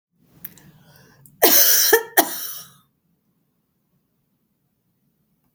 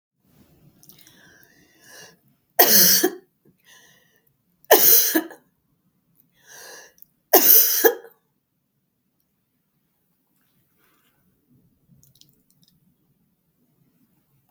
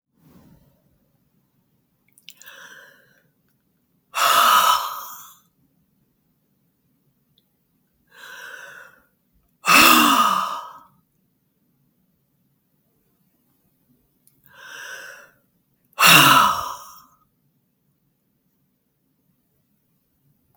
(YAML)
cough_length: 5.5 s
cough_amplitude: 32768
cough_signal_mean_std_ratio: 0.3
three_cough_length: 14.5 s
three_cough_amplitude: 32768
three_cough_signal_mean_std_ratio: 0.26
exhalation_length: 20.6 s
exhalation_amplitude: 32768
exhalation_signal_mean_std_ratio: 0.28
survey_phase: beta (2021-08-13 to 2022-03-07)
age: 65+
gender: Female
wearing_mask: 'No'
symptom_none: true
smoker_status: Ex-smoker
respiratory_condition_asthma: false
respiratory_condition_other: false
recruitment_source: REACT
submission_delay: 2 days
covid_test_result: Negative
covid_test_method: RT-qPCR
influenza_a_test_result: Negative
influenza_b_test_result: Negative